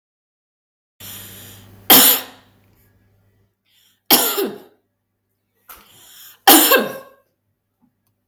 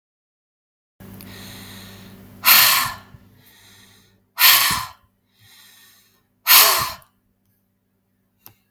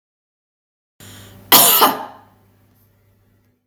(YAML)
three_cough_length: 8.3 s
three_cough_amplitude: 32768
three_cough_signal_mean_std_ratio: 0.29
exhalation_length: 8.7 s
exhalation_amplitude: 32767
exhalation_signal_mean_std_ratio: 0.32
cough_length: 3.7 s
cough_amplitude: 32768
cough_signal_mean_std_ratio: 0.3
survey_phase: beta (2021-08-13 to 2022-03-07)
age: 45-64
gender: Female
wearing_mask: 'No'
symptom_none: true
smoker_status: Ex-smoker
respiratory_condition_asthma: false
respiratory_condition_other: false
recruitment_source: REACT
submission_delay: 2 days
covid_test_result: Negative
covid_test_method: RT-qPCR
influenza_a_test_result: Negative
influenza_b_test_result: Negative